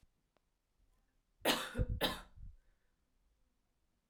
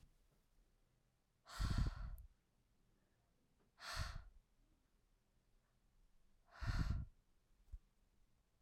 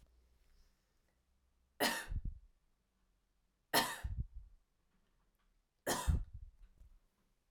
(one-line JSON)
{"cough_length": "4.1 s", "cough_amplitude": 4353, "cough_signal_mean_std_ratio": 0.33, "exhalation_length": "8.6 s", "exhalation_amplitude": 1448, "exhalation_signal_mean_std_ratio": 0.35, "three_cough_length": "7.5 s", "three_cough_amplitude": 4386, "three_cough_signal_mean_std_ratio": 0.34, "survey_phase": "alpha (2021-03-01 to 2021-08-12)", "age": "18-44", "gender": "Female", "wearing_mask": "No", "symptom_cough_any": true, "symptom_fatigue": true, "symptom_headache": true, "symptom_change_to_sense_of_smell_or_taste": true, "symptom_loss_of_taste": true, "symptom_onset": "2 days", "smoker_status": "Ex-smoker", "respiratory_condition_asthma": false, "respiratory_condition_other": false, "recruitment_source": "Test and Trace", "submission_delay": "2 days", "covid_test_result": "Positive", "covid_test_method": "RT-qPCR"}